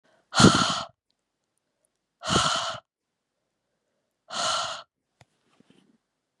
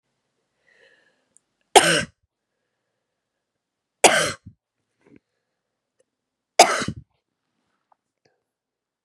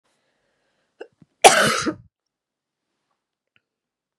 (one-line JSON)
{"exhalation_length": "6.4 s", "exhalation_amplitude": 30761, "exhalation_signal_mean_std_ratio": 0.31, "three_cough_length": "9.0 s", "three_cough_amplitude": 32768, "three_cough_signal_mean_std_ratio": 0.2, "cough_length": "4.2 s", "cough_amplitude": 32768, "cough_signal_mean_std_ratio": 0.22, "survey_phase": "beta (2021-08-13 to 2022-03-07)", "age": "45-64", "gender": "Female", "wearing_mask": "No", "symptom_cough_any": true, "symptom_runny_or_blocked_nose": true, "symptom_abdominal_pain": true, "symptom_fatigue": true, "symptom_headache": true, "symptom_change_to_sense_of_smell_or_taste": true, "symptom_loss_of_taste": true, "symptom_other": true, "symptom_onset": "4 days", "smoker_status": "Ex-smoker", "respiratory_condition_asthma": false, "respiratory_condition_other": false, "recruitment_source": "Test and Trace", "submission_delay": "2 days", "covid_test_result": "Positive", "covid_test_method": "RT-qPCR", "covid_ct_value": 25.8, "covid_ct_gene": "N gene"}